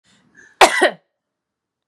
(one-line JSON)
{"cough_length": "1.9 s", "cough_amplitude": 32768, "cough_signal_mean_std_ratio": 0.27, "survey_phase": "beta (2021-08-13 to 2022-03-07)", "age": "18-44", "gender": "Female", "wearing_mask": "No", "symptom_none": true, "smoker_status": "Current smoker (1 to 10 cigarettes per day)", "respiratory_condition_asthma": false, "respiratory_condition_other": false, "recruitment_source": "REACT", "submission_delay": "2 days", "covid_test_result": "Negative", "covid_test_method": "RT-qPCR", "influenza_a_test_result": "Negative", "influenza_b_test_result": "Negative"}